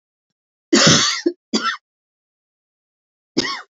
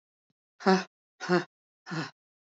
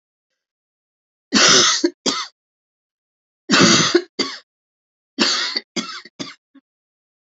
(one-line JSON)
{"cough_length": "3.8 s", "cough_amplitude": 32767, "cough_signal_mean_std_ratio": 0.37, "exhalation_length": "2.5 s", "exhalation_amplitude": 10407, "exhalation_signal_mean_std_ratio": 0.33, "three_cough_length": "7.3 s", "three_cough_amplitude": 32767, "three_cough_signal_mean_std_ratio": 0.39, "survey_phase": "beta (2021-08-13 to 2022-03-07)", "age": "45-64", "gender": "Female", "wearing_mask": "No", "symptom_sore_throat": true, "symptom_fatigue": true, "smoker_status": "Never smoked", "respiratory_condition_asthma": true, "respiratory_condition_other": false, "recruitment_source": "REACT", "submission_delay": "2 days", "covid_test_result": "Negative", "covid_test_method": "RT-qPCR", "influenza_a_test_result": "Negative", "influenza_b_test_result": "Negative"}